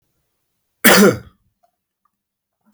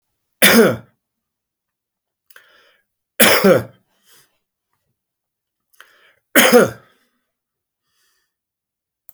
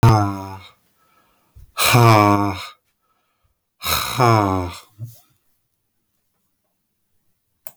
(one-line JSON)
{"cough_length": "2.7 s", "cough_amplitude": 32768, "cough_signal_mean_std_ratio": 0.28, "three_cough_length": "9.1 s", "three_cough_amplitude": 32768, "three_cough_signal_mean_std_ratio": 0.28, "exhalation_length": "7.8 s", "exhalation_amplitude": 31975, "exhalation_signal_mean_std_ratio": 0.38, "survey_phase": "beta (2021-08-13 to 2022-03-07)", "age": "45-64", "gender": "Male", "wearing_mask": "No", "symptom_cough_any": true, "symptom_runny_or_blocked_nose": true, "symptom_sore_throat": true, "symptom_fatigue": true, "symptom_headache": true, "symptom_change_to_sense_of_smell_or_taste": true, "symptom_loss_of_taste": true, "symptom_other": true, "symptom_onset": "5 days", "smoker_status": "Never smoked", "respiratory_condition_asthma": false, "respiratory_condition_other": false, "recruitment_source": "Test and Trace", "submission_delay": "1 day", "covid_test_result": "Positive", "covid_test_method": "RT-qPCR", "covid_ct_value": 19.0, "covid_ct_gene": "ORF1ab gene", "covid_ct_mean": 19.5, "covid_viral_load": "400000 copies/ml", "covid_viral_load_category": "Low viral load (10K-1M copies/ml)"}